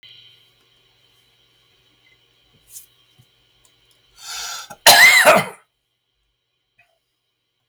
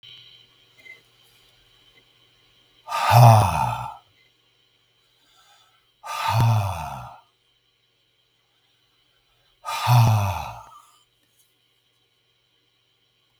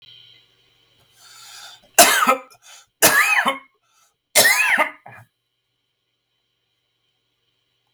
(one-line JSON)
{"cough_length": "7.7 s", "cough_amplitude": 32768, "cough_signal_mean_std_ratio": 0.25, "exhalation_length": "13.4 s", "exhalation_amplitude": 32318, "exhalation_signal_mean_std_ratio": 0.32, "three_cough_length": "7.9 s", "three_cough_amplitude": 32768, "three_cough_signal_mean_std_ratio": 0.35, "survey_phase": "beta (2021-08-13 to 2022-03-07)", "age": "65+", "gender": "Male", "wearing_mask": "No", "symptom_cough_any": true, "symptom_shortness_of_breath": true, "symptom_fatigue": true, "symptom_headache": true, "symptom_change_to_sense_of_smell_or_taste": true, "symptom_onset": "4 days", "smoker_status": "Ex-smoker", "respiratory_condition_asthma": false, "respiratory_condition_other": false, "recruitment_source": "Test and Trace", "submission_delay": "2 days", "covid_test_result": "Positive", "covid_test_method": "RT-qPCR", "covid_ct_value": 18.7, "covid_ct_gene": "ORF1ab gene"}